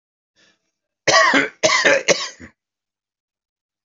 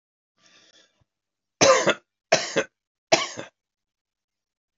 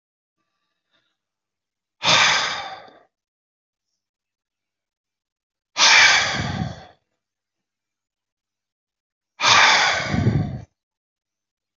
{
  "cough_length": "3.8 s",
  "cough_amplitude": 28351,
  "cough_signal_mean_std_ratio": 0.4,
  "three_cough_length": "4.8 s",
  "three_cough_amplitude": 24241,
  "three_cough_signal_mean_std_ratio": 0.28,
  "exhalation_length": "11.8 s",
  "exhalation_amplitude": 29314,
  "exhalation_signal_mean_std_ratio": 0.36,
  "survey_phase": "alpha (2021-03-01 to 2021-08-12)",
  "age": "65+",
  "gender": "Male",
  "wearing_mask": "No",
  "symptom_cough_any": true,
  "symptom_abdominal_pain": true,
  "symptom_headache": true,
  "symptom_onset": "12 days",
  "smoker_status": "Never smoked",
  "respiratory_condition_asthma": false,
  "respiratory_condition_other": true,
  "recruitment_source": "REACT",
  "submission_delay": "2 days",
  "covid_test_result": "Negative",
  "covid_test_method": "RT-qPCR"
}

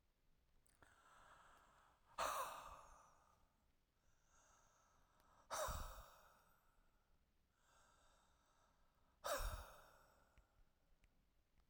{
  "exhalation_length": "11.7 s",
  "exhalation_amplitude": 1213,
  "exhalation_signal_mean_std_ratio": 0.36,
  "survey_phase": "alpha (2021-03-01 to 2021-08-12)",
  "age": "65+",
  "gender": "Male",
  "wearing_mask": "No",
  "symptom_none": true,
  "smoker_status": "Ex-smoker",
  "respiratory_condition_asthma": false,
  "respiratory_condition_other": false,
  "recruitment_source": "REACT",
  "submission_delay": "6 days",
  "covid_test_result": "Negative",
  "covid_test_method": "RT-qPCR"
}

